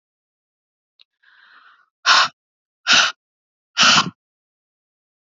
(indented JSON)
{
  "exhalation_length": "5.3 s",
  "exhalation_amplitude": 31211,
  "exhalation_signal_mean_std_ratio": 0.3,
  "survey_phase": "beta (2021-08-13 to 2022-03-07)",
  "age": "18-44",
  "gender": "Female",
  "wearing_mask": "No",
  "symptom_cough_any": true,
  "symptom_runny_or_blocked_nose": true,
  "symptom_sore_throat": true,
  "symptom_fatigue": true,
  "symptom_headache": true,
  "symptom_onset": "6 days",
  "smoker_status": "Never smoked",
  "respiratory_condition_asthma": false,
  "respiratory_condition_other": false,
  "recruitment_source": "Test and Trace",
  "submission_delay": "1 day",
  "covid_test_result": "Positive",
  "covid_test_method": "ePCR"
}